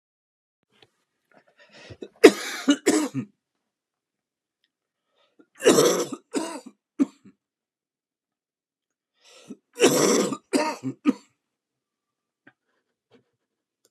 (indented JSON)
{
  "three_cough_length": "13.9 s",
  "three_cough_amplitude": 32768,
  "three_cough_signal_mean_std_ratio": 0.28,
  "survey_phase": "beta (2021-08-13 to 2022-03-07)",
  "age": "65+",
  "gender": "Male",
  "wearing_mask": "No",
  "symptom_cough_any": true,
  "symptom_runny_or_blocked_nose": true,
  "symptom_sore_throat": true,
  "symptom_onset": "3 days",
  "smoker_status": "Ex-smoker",
  "respiratory_condition_asthma": false,
  "respiratory_condition_other": false,
  "recruitment_source": "Test and Trace",
  "submission_delay": "2 days",
  "covid_test_result": "Positive",
  "covid_test_method": "RT-qPCR"
}